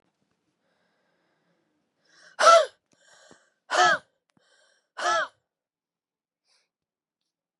{"exhalation_length": "7.6 s", "exhalation_amplitude": 20855, "exhalation_signal_mean_std_ratio": 0.24, "survey_phase": "beta (2021-08-13 to 2022-03-07)", "age": "45-64", "gender": "Female", "wearing_mask": "No", "symptom_cough_any": true, "symptom_runny_or_blocked_nose": true, "symptom_sore_throat": true, "symptom_onset": "3 days", "smoker_status": "Never smoked", "respiratory_condition_asthma": true, "respiratory_condition_other": false, "recruitment_source": "Test and Trace", "submission_delay": "1 day", "covid_test_result": "Positive", "covid_test_method": "RT-qPCR", "covid_ct_value": 17.9, "covid_ct_gene": "ORF1ab gene", "covid_ct_mean": 18.0, "covid_viral_load": "1300000 copies/ml", "covid_viral_load_category": "High viral load (>1M copies/ml)"}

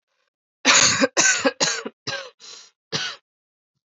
{"cough_length": "3.8 s", "cough_amplitude": 29361, "cough_signal_mean_std_ratio": 0.44, "survey_phase": "alpha (2021-03-01 to 2021-08-12)", "age": "18-44", "gender": "Female", "wearing_mask": "No", "symptom_cough_any": true, "symptom_new_continuous_cough": true, "symptom_diarrhoea": true, "symptom_headache": true, "symptom_change_to_sense_of_smell_or_taste": true, "symptom_onset": "4 days", "smoker_status": "Never smoked", "respiratory_condition_asthma": false, "respiratory_condition_other": false, "recruitment_source": "Test and Trace", "submission_delay": "1 day", "covid_test_result": "Positive", "covid_test_method": "RT-qPCR", "covid_ct_value": 16.8, "covid_ct_gene": "ORF1ab gene", "covid_ct_mean": 17.3, "covid_viral_load": "2200000 copies/ml", "covid_viral_load_category": "High viral load (>1M copies/ml)"}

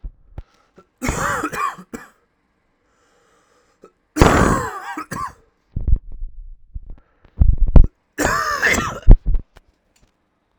{"three_cough_length": "10.6 s", "three_cough_amplitude": 32768, "three_cough_signal_mean_std_ratio": 0.36, "survey_phase": "alpha (2021-03-01 to 2021-08-12)", "age": "18-44", "gender": "Male", "wearing_mask": "No", "symptom_cough_any": true, "symptom_new_continuous_cough": true, "symptom_fatigue": true, "symptom_fever_high_temperature": true, "symptom_change_to_sense_of_smell_or_taste": true, "symptom_loss_of_taste": true, "symptom_onset": "5 days", "smoker_status": "Never smoked", "respiratory_condition_asthma": true, "respiratory_condition_other": false, "recruitment_source": "Test and Trace", "submission_delay": "1 day", "covid_test_result": "Positive", "covid_test_method": "RT-qPCR"}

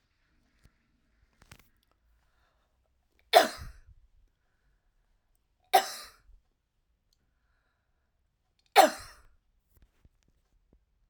{"three_cough_length": "11.1 s", "three_cough_amplitude": 22431, "three_cough_signal_mean_std_ratio": 0.16, "survey_phase": "alpha (2021-03-01 to 2021-08-12)", "age": "65+", "gender": "Female", "wearing_mask": "No", "symptom_none": true, "smoker_status": "Never smoked", "respiratory_condition_asthma": false, "respiratory_condition_other": false, "recruitment_source": "REACT", "submission_delay": "3 days", "covid_test_result": "Negative", "covid_test_method": "RT-qPCR"}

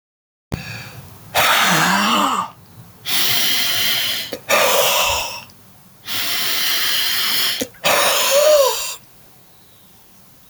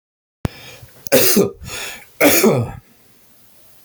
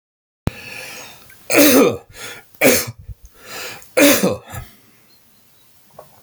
{"exhalation_length": "10.5 s", "exhalation_amplitude": 26775, "exhalation_signal_mean_std_ratio": 0.73, "cough_length": "3.8 s", "cough_amplitude": 29858, "cough_signal_mean_std_ratio": 0.45, "three_cough_length": "6.2 s", "three_cough_amplitude": 31734, "three_cough_signal_mean_std_ratio": 0.4, "survey_phase": "alpha (2021-03-01 to 2021-08-12)", "age": "65+", "gender": "Male", "wearing_mask": "No", "symptom_none": true, "smoker_status": "Never smoked", "respiratory_condition_asthma": false, "respiratory_condition_other": false, "recruitment_source": "REACT", "submission_delay": "1 day", "covid_test_result": "Negative", "covid_test_method": "RT-qPCR"}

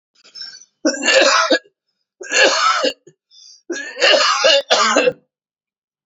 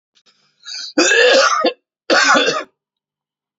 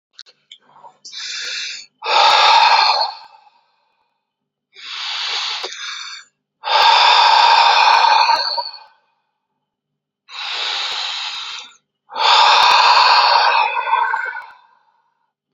{"three_cough_length": "6.1 s", "three_cough_amplitude": 32767, "three_cough_signal_mean_std_ratio": 0.56, "cough_length": "3.6 s", "cough_amplitude": 30563, "cough_signal_mean_std_ratio": 0.53, "exhalation_length": "15.5 s", "exhalation_amplitude": 32767, "exhalation_signal_mean_std_ratio": 0.58, "survey_phase": "beta (2021-08-13 to 2022-03-07)", "age": "18-44", "gender": "Male", "wearing_mask": "No", "symptom_cough_any": true, "symptom_headache": true, "symptom_onset": "4 days", "smoker_status": "Never smoked", "respiratory_condition_asthma": false, "respiratory_condition_other": false, "recruitment_source": "REACT", "submission_delay": "1 day", "covid_test_result": "Negative", "covid_test_method": "RT-qPCR", "influenza_a_test_result": "Negative", "influenza_b_test_result": "Negative"}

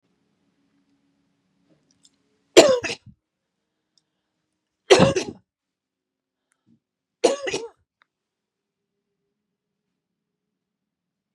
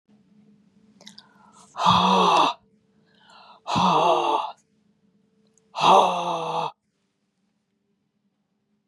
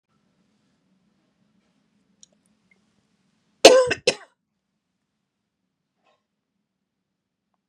{"three_cough_length": "11.3 s", "three_cough_amplitude": 32768, "three_cough_signal_mean_std_ratio": 0.19, "exhalation_length": "8.9 s", "exhalation_amplitude": 22082, "exhalation_signal_mean_std_ratio": 0.42, "cough_length": "7.7 s", "cough_amplitude": 32768, "cough_signal_mean_std_ratio": 0.15, "survey_phase": "beta (2021-08-13 to 2022-03-07)", "age": "65+", "gender": "Female", "wearing_mask": "No", "symptom_none": true, "smoker_status": "Never smoked", "respiratory_condition_asthma": false, "respiratory_condition_other": false, "recruitment_source": "REACT", "submission_delay": "5 days", "covid_test_result": "Negative", "covid_test_method": "RT-qPCR", "influenza_a_test_result": "Negative", "influenza_b_test_result": "Negative"}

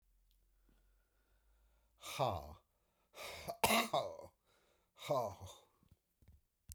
{"exhalation_length": "6.7 s", "exhalation_amplitude": 5243, "exhalation_signal_mean_std_ratio": 0.35, "survey_phase": "beta (2021-08-13 to 2022-03-07)", "age": "65+", "gender": "Male", "wearing_mask": "No", "symptom_cough_any": true, "symptom_new_continuous_cough": true, "symptom_diarrhoea": true, "symptom_fatigue": true, "symptom_onset": "3 days", "smoker_status": "Ex-smoker", "respiratory_condition_asthma": false, "respiratory_condition_other": false, "recruitment_source": "Test and Trace", "submission_delay": "1 day", "covid_test_result": "Positive", "covid_test_method": "RT-qPCR", "covid_ct_value": 20.8, "covid_ct_gene": "N gene"}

